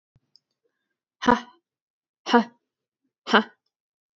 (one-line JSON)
{"exhalation_length": "4.2 s", "exhalation_amplitude": 25475, "exhalation_signal_mean_std_ratio": 0.22, "survey_phase": "beta (2021-08-13 to 2022-03-07)", "age": "18-44", "gender": "Female", "wearing_mask": "No", "symptom_none": true, "smoker_status": "Never smoked", "respiratory_condition_asthma": false, "respiratory_condition_other": false, "recruitment_source": "Test and Trace", "submission_delay": "0 days", "covid_test_result": "Negative", "covid_test_method": "LFT"}